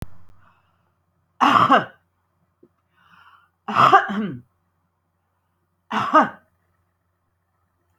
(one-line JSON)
{"three_cough_length": "8.0 s", "three_cough_amplitude": 27594, "three_cough_signal_mean_std_ratio": 0.31, "survey_phase": "alpha (2021-03-01 to 2021-08-12)", "age": "65+", "gender": "Female", "wearing_mask": "No", "symptom_none": true, "smoker_status": "Ex-smoker", "respiratory_condition_asthma": false, "respiratory_condition_other": false, "recruitment_source": "REACT", "submission_delay": "2 days", "covid_test_result": "Negative", "covid_test_method": "RT-qPCR"}